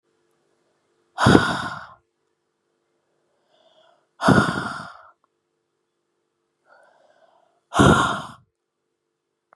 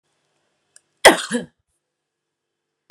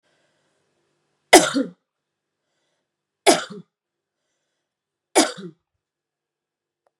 {"exhalation_length": "9.6 s", "exhalation_amplitude": 32768, "exhalation_signal_mean_std_ratio": 0.28, "cough_length": "2.9 s", "cough_amplitude": 32768, "cough_signal_mean_std_ratio": 0.19, "three_cough_length": "7.0 s", "three_cough_amplitude": 32768, "three_cough_signal_mean_std_ratio": 0.2, "survey_phase": "beta (2021-08-13 to 2022-03-07)", "age": "18-44", "gender": "Female", "wearing_mask": "No", "symptom_runny_or_blocked_nose": true, "symptom_sore_throat": true, "symptom_abdominal_pain": true, "symptom_fatigue": true, "symptom_headache": true, "symptom_other": true, "smoker_status": "Current smoker (1 to 10 cigarettes per day)", "respiratory_condition_asthma": false, "respiratory_condition_other": false, "recruitment_source": "Test and Trace", "submission_delay": "1 day", "covid_test_result": "Positive", "covid_test_method": "LFT"}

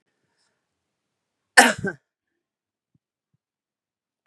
{"cough_length": "4.3 s", "cough_amplitude": 32768, "cough_signal_mean_std_ratio": 0.15, "survey_phase": "beta (2021-08-13 to 2022-03-07)", "age": "45-64", "gender": "Female", "wearing_mask": "No", "symptom_runny_or_blocked_nose": true, "smoker_status": "Ex-smoker", "respiratory_condition_asthma": false, "respiratory_condition_other": false, "recruitment_source": "REACT", "submission_delay": "1 day", "covid_test_result": "Negative", "covid_test_method": "RT-qPCR"}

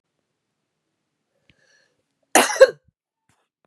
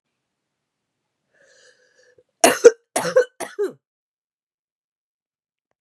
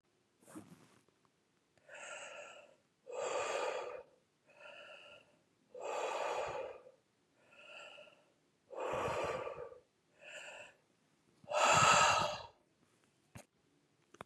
{"cough_length": "3.7 s", "cough_amplitude": 32768, "cough_signal_mean_std_ratio": 0.18, "three_cough_length": "5.8 s", "three_cough_amplitude": 32768, "three_cough_signal_mean_std_ratio": 0.2, "exhalation_length": "14.3 s", "exhalation_amplitude": 5645, "exhalation_signal_mean_std_ratio": 0.4, "survey_phase": "beta (2021-08-13 to 2022-03-07)", "age": "45-64", "gender": "Female", "wearing_mask": "No", "symptom_cough_any": true, "symptom_runny_or_blocked_nose": true, "symptom_shortness_of_breath": true, "symptom_sore_throat": true, "symptom_fatigue": true, "symptom_fever_high_temperature": true, "symptom_headache": true, "symptom_change_to_sense_of_smell_or_taste": true, "smoker_status": "Never smoked", "respiratory_condition_asthma": false, "respiratory_condition_other": false, "recruitment_source": "Test and Trace", "submission_delay": "2 days", "covid_test_result": "Positive", "covid_test_method": "RT-qPCR", "covid_ct_value": 20.2, "covid_ct_gene": "ORF1ab gene"}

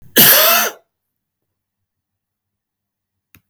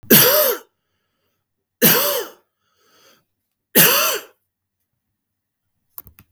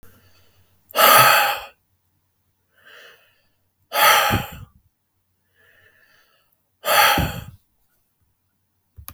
{"cough_length": "3.5 s", "cough_amplitude": 32768, "cough_signal_mean_std_ratio": 0.33, "three_cough_length": "6.3 s", "three_cough_amplitude": 32768, "three_cough_signal_mean_std_ratio": 0.36, "exhalation_length": "9.1 s", "exhalation_amplitude": 32766, "exhalation_signal_mean_std_ratio": 0.34, "survey_phase": "beta (2021-08-13 to 2022-03-07)", "age": "45-64", "gender": "Male", "wearing_mask": "No", "symptom_none": true, "smoker_status": "Never smoked", "respiratory_condition_asthma": false, "respiratory_condition_other": false, "recruitment_source": "REACT", "submission_delay": "2 days", "covid_test_result": "Negative", "covid_test_method": "RT-qPCR", "influenza_a_test_result": "Negative", "influenza_b_test_result": "Negative"}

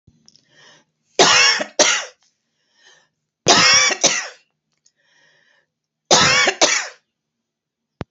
{"three_cough_length": "8.1 s", "three_cough_amplitude": 32767, "three_cough_signal_mean_std_ratio": 0.41, "survey_phase": "beta (2021-08-13 to 2022-03-07)", "age": "45-64", "gender": "Female", "wearing_mask": "No", "symptom_none": true, "smoker_status": "Never smoked", "respiratory_condition_asthma": false, "respiratory_condition_other": false, "recruitment_source": "REACT", "submission_delay": "3 days", "covid_test_result": "Negative", "covid_test_method": "RT-qPCR", "influenza_a_test_result": "Negative", "influenza_b_test_result": "Negative"}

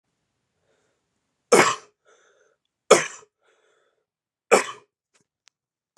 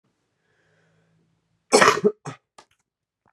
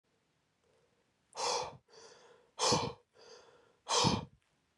{"three_cough_length": "6.0 s", "three_cough_amplitude": 32768, "three_cough_signal_mean_std_ratio": 0.21, "cough_length": "3.3 s", "cough_amplitude": 30819, "cough_signal_mean_std_ratio": 0.24, "exhalation_length": "4.8 s", "exhalation_amplitude": 5730, "exhalation_signal_mean_std_ratio": 0.38, "survey_phase": "beta (2021-08-13 to 2022-03-07)", "age": "18-44", "gender": "Male", "wearing_mask": "No", "symptom_cough_any": true, "symptom_onset": "7 days", "smoker_status": "Never smoked", "respiratory_condition_asthma": false, "respiratory_condition_other": false, "recruitment_source": "Test and Trace", "submission_delay": "1 day", "covid_test_result": "Positive", "covid_test_method": "RT-qPCR", "covid_ct_value": 28.8, "covid_ct_gene": "ORF1ab gene"}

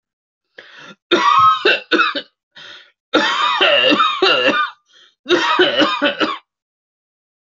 {"cough_length": "7.4 s", "cough_amplitude": 31651, "cough_signal_mean_std_ratio": 0.61, "survey_phase": "alpha (2021-03-01 to 2021-08-12)", "age": "18-44", "gender": "Male", "wearing_mask": "No", "symptom_none": true, "smoker_status": "Never smoked", "respiratory_condition_asthma": false, "respiratory_condition_other": false, "recruitment_source": "REACT", "submission_delay": "1 day", "covid_test_result": "Negative", "covid_test_method": "RT-qPCR"}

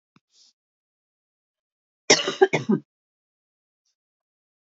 {"cough_length": "4.8 s", "cough_amplitude": 29179, "cough_signal_mean_std_ratio": 0.21, "survey_phase": "beta (2021-08-13 to 2022-03-07)", "age": "45-64", "gender": "Female", "wearing_mask": "No", "symptom_none": true, "smoker_status": "Ex-smoker", "respiratory_condition_asthma": false, "respiratory_condition_other": false, "recruitment_source": "REACT", "submission_delay": "1 day", "covid_test_result": "Negative", "covid_test_method": "RT-qPCR", "influenza_a_test_result": "Negative", "influenza_b_test_result": "Negative"}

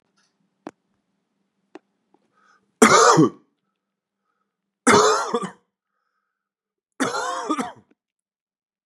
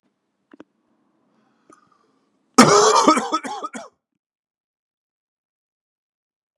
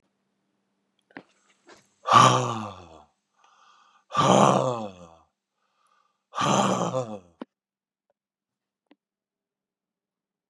{"three_cough_length": "8.9 s", "three_cough_amplitude": 32767, "three_cough_signal_mean_std_ratio": 0.3, "cough_length": "6.6 s", "cough_amplitude": 32768, "cough_signal_mean_std_ratio": 0.27, "exhalation_length": "10.5 s", "exhalation_amplitude": 23644, "exhalation_signal_mean_std_ratio": 0.31, "survey_phase": "beta (2021-08-13 to 2022-03-07)", "age": "45-64", "gender": "Male", "wearing_mask": "No", "symptom_cough_any": true, "symptom_runny_or_blocked_nose": true, "symptom_onset": "3 days", "smoker_status": "Current smoker (1 to 10 cigarettes per day)", "respiratory_condition_asthma": false, "respiratory_condition_other": false, "recruitment_source": "Test and Trace", "submission_delay": "2 days", "covid_test_result": "Positive", "covid_test_method": "RT-qPCR", "covid_ct_value": 21.8, "covid_ct_gene": "ORF1ab gene", "covid_ct_mean": 22.1, "covid_viral_load": "57000 copies/ml", "covid_viral_load_category": "Low viral load (10K-1M copies/ml)"}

